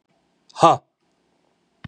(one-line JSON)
{"exhalation_length": "1.9 s", "exhalation_amplitude": 31231, "exhalation_signal_mean_std_ratio": 0.22, "survey_phase": "beta (2021-08-13 to 2022-03-07)", "age": "45-64", "gender": "Male", "wearing_mask": "No", "symptom_none": true, "symptom_onset": "13 days", "smoker_status": "Ex-smoker", "respiratory_condition_asthma": false, "respiratory_condition_other": false, "recruitment_source": "REACT", "submission_delay": "3 days", "covid_test_result": "Negative", "covid_test_method": "RT-qPCR", "influenza_a_test_result": "Unknown/Void", "influenza_b_test_result": "Unknown/Void"}